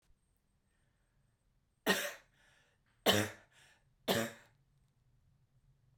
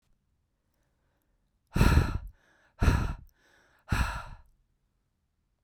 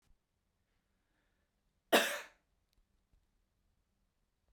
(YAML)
three_cough_length: 6.0 s
three_cough_amplitude: 6480
three_cough_signal_mean_std_ratio: 0.27
exhalation_length: 5.6 s
exhalation_amplitude: 13877
exhalation_signal_mean_std_ratio: 0.33
cough_length: 4.5 s
cough_amplitude: 8106
cough_signal_mean_std_ratio: 0.17
survey_phase: beta (2021-08-13 to 2022-03-07)
age: 18-44
gender: Female
wearing_mask: 'No'
symptom_cough_any: true
symptom_runny_or_blocked_nose: true
symptom_sore_throat: true
symptom_onset: 5 days
smoker_status: Current smoker (1 to 10 cigarettes per day)
respiratory_condition_asthma: false
respiratory_condition_other: false
recruitment_source: REACT
submission_delay: 2 days
covid_test_result: Negative
covid_test_method: RT-qPCR
influenza_a_test_result: Negative
influenza_b_test_result: Negative